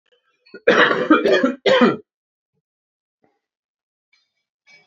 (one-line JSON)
{"cough_length": "4.9 s", "cough_amplitude": 27689, "cough_signal_mean_std_ratio": 0.38, "survey_phase": "alpha (2021-03-01 to 2021-08-12)", "age": "18-44", "gender": "Male", "wearing_mask": "No", "symptom_cough_any": true, "symptom_headache": true, "symptom_onset": "3 days", "smoker_status": "Never smoked", "respiratory_condition_asthma": false, "respiratory_condition_other": false, "recruitment_source": "Test and Trace", "submission_delay": "0 days", "covid_test_result": "Positive", "covid_test_method": "RT-qPCR"}